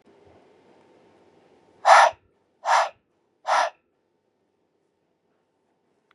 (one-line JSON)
{"exhalation_length": "6.1 s", "exhalation_amplitude": 27820, "exhalation_signal_mean_std_ratio": 0.25, "survey_phase": "beta (2021-08-13 to 2022-03-07)", "age": "18-44", "gender": "Male", "wearing_mask": "No", "symptom_cough_any": true, "symptom_runny_or_blocked_nose": true, "symptom_sore_throat": true, "symptom_fatigue": true, "symptom_onset": "2 days", "smoker_status": "Ex-smoker", "respiratory_condition_asthma": false, "respiratory_condition_other": false, "recruitment_source": "Test and Trace", "submission_delay": "2 days", "covid_test_result": "Positive", "covid_test_method": "RT-qPCR", "covid_ct_value": 17.1, "covid_ct_gene": "ORF1ab gene", "covid_ct_mean": 17.6, "covid_viral_load": "1700000 copies/ml", "covid_viral_load_category": "High viral load (>1M copies/ml)"}